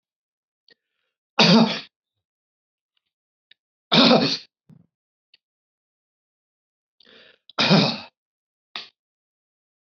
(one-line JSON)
{"three_cough_length": "10.0 s", "three_cough_amplitude": 27168, "three_cough_signal_mean_std_ratio": 0.27, "survey_phase": "beta (2021-08-13 to 2022-03-07)", "age": "45-64", "gender": "Male", "wearing_mask": "No", "symptom_none": true, "smoker_status": "Never smoked", "respiratory_condition_asthma": true, "respiratory_condition_other": false, "recruitment_source": "REACT", "submission_delay": "1 day", "covid_test_result": "Negative", "covid_test_method": "RT-qPCR"}